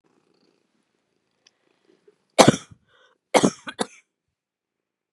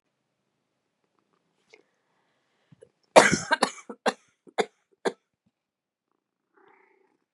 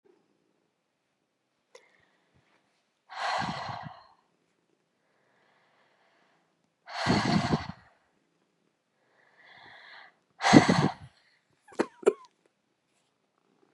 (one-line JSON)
{"three_cough_length": "5.1 s", "three_cough_amplitude": 32768, "three_cough_signal_mean_std_ratio": 0.18, "cough_length": "7.3 s", "cough_amplitude": 32768, "cough_signal_mean_std_ratio": 0.18, "exhalation_length": "13.7 s", "exhalation_amplitude": 25656, "exhalation_signal_mean_std_ratio": 0.25, "survey_phase": "beta (2021-08-13 to 2022-03-07)", "age": "45-64", "gender": "Female", "wearing_mask": "No", "symptom_none": true, "smoker_status": "Never smoked", "respiratory_condition_asthma": false, "respiratory_condition_other": false, "recruitment_source": "REACT", "submission_delay": "4 days", "covid_test_result": "Negative", "covid_test_method": "RT-qPCR", "influenza_a_test_result": "Negative", "influenza_b_test_result": "Negative"}